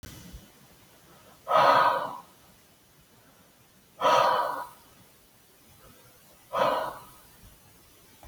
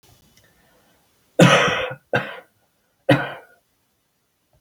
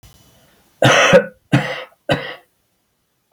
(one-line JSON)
{"exhalation_length": "8.3 s", "exhalation_amplitude": 12916, "exhalation_signal_mean_std_ratio": 0.38, "three_cough_length": "4.6 s", "three_cough_amplitude": 28097, "three_cough_signal_mean_std_ratio": 0.31, "cough_length": "3.3 s", "cough_amplitude": 29605, "cough_signal_mean_std_ratio": 0.38, "survey_phase": "alpha (2021-03-01 to 2021-08-12)", "age": "65+", "gender": "Male", "wearing_mask": "No", "symptom_none": true, "smoker_status": "Never smoked", "respiratory_condition_asthma": false, "respiratory_condition_other": false, "recruitment_source": "REACT", "submission_delay": "1 day", "covid_test_result": "Negative", "covid_test_method": "RT-qPCR"}